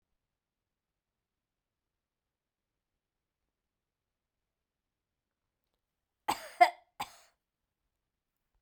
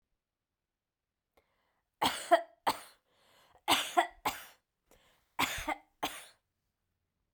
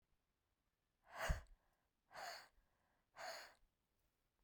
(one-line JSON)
{"cough_length": "8.6 s", "cough_amplitude": 10904, "cough_signal_mean_std_ratio": 0.1, "three_cough_length": "7.3 s", "three_cough_amplitude": 7860, "three_cough_signal_mean_std_ratio": 0.29, "exhalation_length": "4.4 s", "exhalation_amplitude": 1103, "exhalation_signal_mean_std_ratio": 0.31, "survey_phase": "beta (2021-08-13 to 2022-03-07)", "age": "45-64", "gender": "Female", "wearing_mask": "No", "symptom_none": true, "smoker_status": "Never smoked", "respiratory_condition_asthma": false, "respiratory_condition_other": false, "recruitment_source": "REACT", "submission_delay": "1 day", "covid_test_result": "Negative", "covid_test_method": "RT-qPCR"}